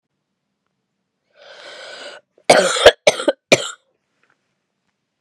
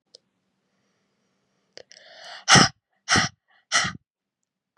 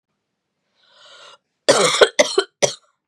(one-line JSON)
{"cough_length": "5.2 s", "cough_amplitude": 32768, "cough_signal_mean_std_ratio": 0.26, "exhalation_length": "4.8 s", "exhalation_amplitude": 30972, "exhalation_signal_mean_std_ratio": 0.26, "three_cough_length": "3.1 s", "three_cough_amplitude": 32768, "three_cough_signal_mean_std_ratio": 0.34, "survey_phase": "beta (2021-08-13 to 2022-03-07)", "age": "18-44", "gender": "Female", "wearing_mask": "No", "symptom_cough_any": true, "symptom_runny_or_blocked_nose": true, "symptom_sore_throat": true, "symptom_fatigue": true, "symptom_headache": true, "symptom_onset": "3 days", "smoker_status": "Never smoked", "respiratory_condition_asthma": false, "respiratory_condition_other": false, "recruitment_source": "Test and Trace", "submission_delay": "1 day", "covid_test_result": "Positive", "covid_test_method": "RT-qPCR", "covid_ct_value": 17.1, "covid_ct_gene": "ORF1ab gene", "covid_ct_mean": 17.7, "covid_viral_load": "1600000 copies/ml", "covid_viral_load_category": "High viral load (>1M copies/ml)"}